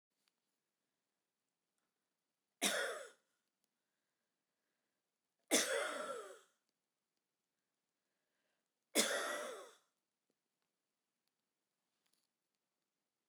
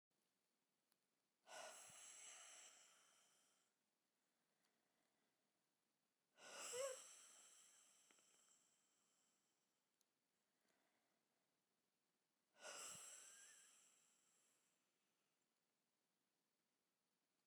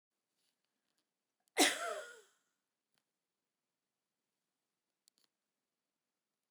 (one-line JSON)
{"three_cough_length": "13.3 s", "three_cough_amplitude": 4426, "three_cough_signal_mean_std_ratio": 0.27, "exhalation_length": "17.5 s", "exhalation_amplitude": 367, "exhalation_signal_mean_std_ratio": 0.35, "cough_length": "6.5 s", "cough_amplitude": 4997, "cough_signal_mean_std_ratio": 0.17, "survey_phase": "beta (2021-08-13 to 2022-03-07)", "age": "65+", "gender": "Female", "wearing_mask": "No", "symptom_none": true, "smoker_status": "Never smoked", "respiratory_condition_asthma": true, "respiratory_condition_other": false, "recruitment_source": "REACT", "submission_delay": "2 days", "covid_test_result": "Negative", "covid_test_method": "RT-qPCR"}